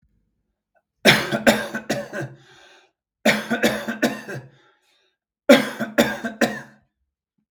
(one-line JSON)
{"three_cough_length": "7.5 s", "three_cough_amplitude": 32768, "three_cough_signal_mean_std_ratio": 0.38, "survey_phase": "beta (2021-08-13 to 2022-03-07)", "age": "18-44", "gender": "Male", "wearing_mask": "No", "symptom_shortness_of_breath": true, "symptom_fatigue": true, "symptom_change_to_sense_of_smell_or_taste": true, "symptom_onset": "3 days", "smoker_status": "Ex-smoker", "respiratory_condition_asthma": false, "respiratory_condition_other": false, "recruitment_source": "Test and Trace", "submission_delay": "2 days", "covid_test_result": "Positive", "covid_test_method": "RT-qPCR", "covid_ct_value": 29.8, "covid_ct_gene": "N gene"}